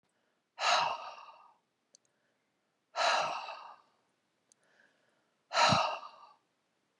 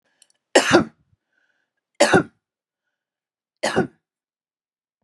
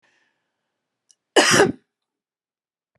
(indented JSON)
{
  "exhalation_length": "7.0 s",
  "exhalation_amplitude": 7261,
  "exhalation_signal_mean_std_ratio": 0.36,
  "three_cough_length": "5.0 s",
  "three_cough_amplitude": 32665,
  "three_cough_signal_mean_std_ratio": 0.27,
  "cough_length": "3.0 s",
  "cough_amplitude": 32767,
  "cough_signal_mean_std_ratio": 0.27,
  "survey_phase": "beta (2021-08-13 to 2022-03-07)",
  "age": "45-64",
  "gender": "Female",
  "wearing_mask": "No",
  "symptom_none": true,
  "smoker_status": "Never smoked",
  "respiratory_condition_asthma": false,
  "respiratory_condition_other": false,
  "recruitment_source": "REACT",
  "submission_delay": "1 day",
  "covid_test_result": "Negative",
  "covid_test_method": "RT-qPCR",
  "influenza_a_test_result": "Negative",
  "influenza_b_test_result": "Negative"
}